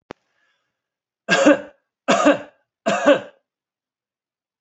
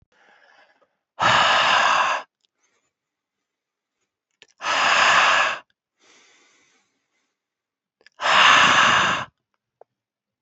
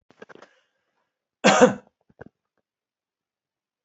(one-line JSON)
{"three_cough_length": "4.6 s", "three_cough_amplitude": 32767, "three_cough_signal_mean_std_ratio": 0.34, "exhalation_length": "10.4 s", "exhalation_amplitude": 26275, "exhalation_signal_mean_std_ratio": 0.45, "cough_length": "3.8 s", "cough_amplitude": 27811, "cough_signal_mean_std_ratio": 0.21, "survey_phase": "beta (2021-08-13 to 2022-03-07)", "age": "45-64", "gender": "Male", "wearing_mask": "No", "symptom_runny_or_blocked_nose": true, "symptom_sore_throat": true, "symptom_fatigue": true, "symptom_change_to_sense_of_smell_or_taste": true, "smoker_status": "Never smoked", "respiratory_condition_asthma": false, "respiratory_condition_other": false, "recruitment_source": "Test and Trace", "submission_delay": "2 days", "covid_test_result": "Positive", "covid_test_method": "RT-qPCR", "covid_ct_value": 25.4, "covid_ct_gene": "ORF1ab gene", "covid_ct_mean": 25.7, "covid_viral_load": "3800 copies/ml", "covid_viral_load_category": "Minimal viral load (< 10K copies/ml)"}